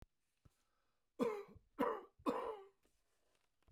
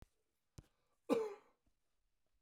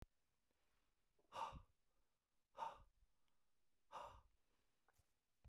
{"three_cough_length": "3.7 s", "three_cough_amplitude": 2049, "three_cough_signal_mean_std_ratio": 0.37, "cough_length": "2.4 s", "cough_amplitude": 2666, "cough_signal_mean_std_ratio": 0.26, "exhalation_length": "5.5 s", "exhalation_amplitude": 409, "exhalation_signal_mean_std_ratio": 0.35, "survey_phase": "beta (2021-08-13 to 2022-03-07)", "age": "65+", "gender": "Male", "wearing_mask": "No", "symptom_cough_any": true, "symptom_sore_throat": true, "symptom_fatigue": true, "symptom_onset": "5 days", "smoker_status": "Never smoked", "respiratory_condition_asthma": false, "respiratory_condition_other": false, "recruitment_source": "Test and Trace", "submission_delay": "1 day", "covid_test_result": "Negative", "covid_test_method": "RT-qPCR"}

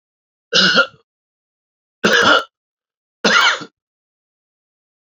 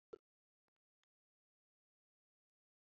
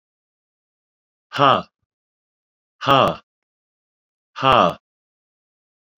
{"three_cough_length": "5.0 s", "three_cough_amplitude": 32768, "three_cough_signal_mean_std_ratio": 0.38, "cough_length": "2.8 s", "cough_amplitude": 309, "cough_signal_mean_std_ratio": 0.07, "exhalation_length": "6.0 s", "exhalation_amplitude": 29352, "exhalation_signal_mean_std_ratio": 0.27, "survey_phase": "beta (2021-08-13 to 2022-03-07)", "age": "65+", "gender": "Male", "wearing_mask": "No", "symptom_cough_any": true, "symptom_sore_throat": true, "symptom_onset": "6 days", "smoker_status": "Ex-smoker", "respiratory_condition_asthma": false, "respiratory_condition_other": false, "recruitment_source": "Test and Trace", "submission_delay": "1 day", "covid_test_result": "Negative", "covid_test_method": "ePCR"}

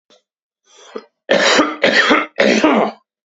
{"three_cough_length": "3.3 s", "three_cough_amplitude": 29374, "three_cough_signal_mean_std_ratio": 0.57, "survey_phase": "beta (2021-08-13 to 2022-03-07)", "age": "18-44", "gender": "Male", "wearing_mask": "No", "symptom_cough_any": true, "symptom_new_continuous_cough": true, "symptom_headache": true, "smoker_status": "Never smoked", "respiratory_condition_asthma": false, "respiratory_condition_other": false, "recruitment_source": "Test and Trace", "submission_delay": "2 days", "covid_test_result": "Negative", "covid_test_method": "RT-qPCR"}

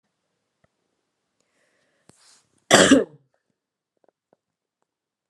{"cough_length": "5.3 s", "cough_amplitude": 32171, "cough_signal_mean_std_ratio": 0.19, "survey_phase": "beta (2021-08-13 to 2022-03-07)", "age": "18-44", "gender": "Female", "wearing_mask": "No", "symptom_fatigue": true, "symptom_headache": true, "symptom_onset": "12 days", "smoker_status": "Never smoked", "respiratory_condition_asthma": false, "respiratory_condition_other": false, "recruitment_source": "REACT", "submission_delay": "1 day", "covid_test_result": "Negative", "covid_test_method": "RT-qPCR"}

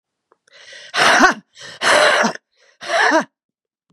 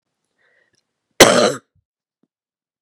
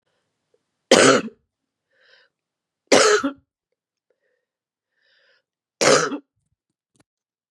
{"exhalation_length": "3.9 s", "exhalation_amplitude": 32767, "exhalation_signal_mean_std_ratio": 0.48, "cough_length": "2.8 s", "cough_amplitude": 32768, "cough_signal_mean_std_ratio": 0.25, "three_cough_length": "7.5 s", "three_cough_amplitude": 32644, "three_cough_signal_mean_std_ratio": 0.28, "survey_phase": "beta (2021-08-13 to 2022-03-07)", "age": "45-64", "gender": "Female", "wearing_mask": "No", "symptom_cough_any": true, "symptom_runny_or_blocked_nose": true, "symptom_fatigue": true, "symptom_change_to_sense_of_smell_or_taste": true, "symptom_other": true, "symptom_onset": "3 days", "smoker_status": "Never smoked", "respiratory_condition_asthma": true, "respiratory_condition_other": false, "recruitment_source": "Test and Trace", "submission_delay": "2 days", "covid_test_result": "Positive", "covid_test_method": "RT-qPCR", "covid_ct_value": 13.4, "covid_ct_gene": "ORF1ab gene"}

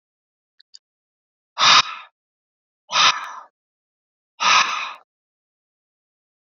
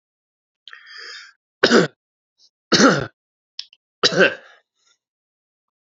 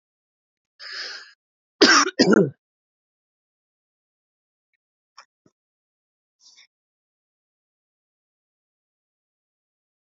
{"exhalation_length": "6.6 s", "exhalation_amplitude": 28255, "exhalation_signal_mean_std_ratio": 0.3, "three_cough_length": "5.8 s", "three_cough_amplitude": 31525, "three_cough_signal_mean_std_ratio": 0.3, "cough_length": "10.1 s", "cough_amplitude": 32767, "cough_signal_mean_std_ratio": 0.19, "survey_phase": "beta (2021-08-13 to 2022-03-07)", "age": "18-44", "gender": "Male", "wearing_mask": "No", "symptom_cough_any": true, "symptom_runny_or_blocked_nose": true, "symptom_shortness_of_breath": true, "symptom_abdominal_pain": true, "symptom_headache": true, "symptom_change_to_sense_of_smell_or_taste": true, "symptom_loss_of_taste": true, "symptom_onset": "4 days", "smoker_status": "Never smoked", "respiratory_condition_asthma": false, "respiratory_condition_other": false, "recruitment_source": "Test and Trace", "submission_delay": "2 days", "covid_test_result": "Positive", "covid_test_method": "RT-qPCR", "covid_ct_value": 19.2, "covid_ct_gene": "ORF1ab gene", "covid_ct_mean": 19.7, "covid_viral_load": "340000 copies/ml", "covid_viral_load_category": "Low viral load (10K-1M copies/ml)"}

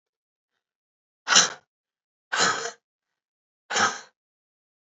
{"exhalation_length": "4.9 s", "exhalation_amplitude": 24189, "exhalation_signal_mean_std_ratio": 0.29, "survey_phase": "beta (2021-08-13 to 2022-03-07)", "age": "18-44", "gender": "Female", "wearing_mask": "No", "symptom_cough_any": true, "symptom_runny_or_blocked_nose": true, "symptom_shortness_of_breath": true, "symptom_sore_throat": true, "symptom_onset": "4 days", "smoker_status": "Current smoker (1 to 10 cigarettes per day)", "respiratory_condition_asthma": false, "respiratory_condition_other": false, "recruitment_source": "Test and Trace", "submission_delay": "1 day", "covid_test_result": "Negative", "covid_test_method": "RT-qPCR"}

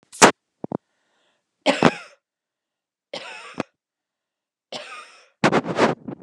{"three_cough_length": "6.2 s", "three_cough_amplitude": 32768, "three_cough_signal_mean_std_ratio": 0.27, "survey_phase": "beta (2021-08-13 to 2022-03-07)", "age": "45-64", "gender": "Female", "wearing_mask": "No", "symptom_none": true, "smoker_status": "Never smoked", "respiratory_condition_asthma": false, "respiratory_condition_other": false, "recruitment_source": "REACT", "submission_delay": "1 day", "covid_test_result": "Negative", "covid_test_method": "RT-qPCR", "influenza_a_test_result": "Unknown/Void", "influenza_b_test_result": "Unknown/Void"}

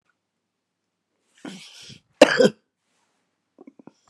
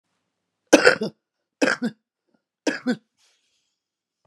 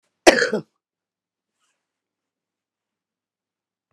{"cough_length": "4.1 s", "cough_amplitude": 32768, "cough_signal_mean_std_ratio": 0.18, "three_cough_length": "4.3 s", "three_cough_amplitude": 32767, "three_cough_signal_mean_std_ratio": 0.26, "exhalation_length": "3.9 s", "exhalation_amplitude": 32768, "exhalation_signal_mean_std_ratio": 0.17, "survey_phase": "beta (2021-08-13 to 2022-03-07)", "age": "65+", "gender": "Female", "wearing_mask": "No", "symptom_cough_any": true, "smoker_status": "Current smoker (11 or more cigarettes per day)", "respiratory_condition_asthma": false, "respiratory_condition_other": true, "recruitment_source": "REACT", "submission_delay": "2 days", "covid_test_result": "Negative", "covid_test_method": "RT-qPCR"}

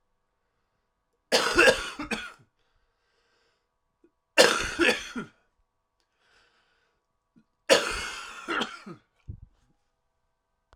{"three_cough_length": "10.8 s", "three_cough_amplitude": 23371, "three_cough_signal_mean_std_ratio": 0.3, "survey_phase": "alpha (2021-03-01 to 2021-08-12)", "age": "18-44", "gender": "Male", "wearing_mask": "No", "symptom_cough_any": true, "symptom_shortness_of_breath": true, "symptom_fatigue": true, "symptom_headache": true, "symptom_loss_of_taste": true, "symptom_onset": "6 days", "smoker_status": "Ex-smoker", "respiratory_condition_asthma": false, "respiratory_condition_other": true, "recruitment_source": "REACT", "submission_delay": "1 day", "covid_test_result": "Positive", "covid_test_method": "RT-qPCR", "covid_ct_value": 21.0, "covid_ct_gene": "N gene"}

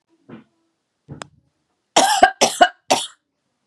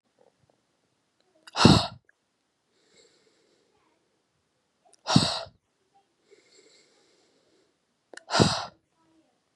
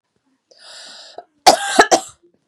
{"three_cough_length": "3.7 s", "three_cough_amplitude": 32768, "three_cough_signal_mean_std_ratio": 0.31, "exhalation_length": "9.6 s", "exhalation_amplitude": 29500, "exhalation_signal_mean_std_ratio": 0.22, "cough_length": "2.5 s", "cough_amplitude": 32768, "cough_signal_mean_std_ratio": 0.31, "survey_phase": "beta (2021-08-13 to 2022-03-07)", "age": "18-44", "gender": "Female", "wearing_mask": "No", "symptom_cough_any": true, "symptom_runny_or_blocked_nose": true, "symptom_sore_throat": true, "symptom_fatigue": true, "smoker_status": "Ex-smoker", "respiratory_condition_asthma": true, "respiratory_condition_other": false, "recruitment_source": "REACT", "submission_delay": "3 days", "covid_test_result": "Positive", "covid_test_method": "RT-qPCR", "covid_ct_value": 25.0, "covid_ct_gene": "E gene", "influenza_a_test_result": "Negative", "influenza_b_test_result": "Negative"}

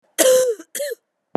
{"cough_length": "1.4 s", "cough_amplitude": 28392, "cough_signal_mean_std_ratio": 0.54, "survey_phase": "beta (2021-08-13 to 2022-03-07)", "age": "45-64", "gender": "Female", "wearing_mask": "Yes", "symptom_cough_any": true, "symptom_runny_or_blocked_nose": true, "symptom_shortness_of_breath": true, "symptom_fatigue": true, "symptom_fever_high_temperature": true, "symptom_change_to_sense_of_smell_or_taste": true, "symptom_onset": "3 days", "smoker_status": "Never smoked", "respiratory_condition_asthma": false, "respiratory_condition_other": false, "recruitment_source": "Test and Trace", "submission_delay": "2 days", "covid_test_result": "Positive", "covid_test_method": "RT-qPCR"}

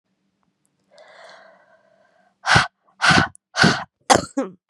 {"exhalation_length": "4.7 s", "exhalation_amplitude": 32767, "exhalation_signal_mean_std_ratio": 0.34, "survey_phase": "beta (2021-08-13 to 2022-03-07)", "age": "18-44", "gender": "Female", "wearing_mask": "No", "symptom_cough_any": true, "symptom_new_continuous_cough": true, "symptom_runny_or_blocked_nose": true, "symptom_sore_throat": true, "symptom_fatigue": true, "symptom_fever_high_temperature": true, "symptom_headache": true, "symptom_onset": "3 days", "smoker_status": "Never smoked", "respiratory_condition_asthma": false, "respiratory_condition_other": false, "recruitment_source": "Test and Trace", "submission_delay": "2 days", "covid_test_result": "Positive", "covid_test_method": "RT-qPCR"}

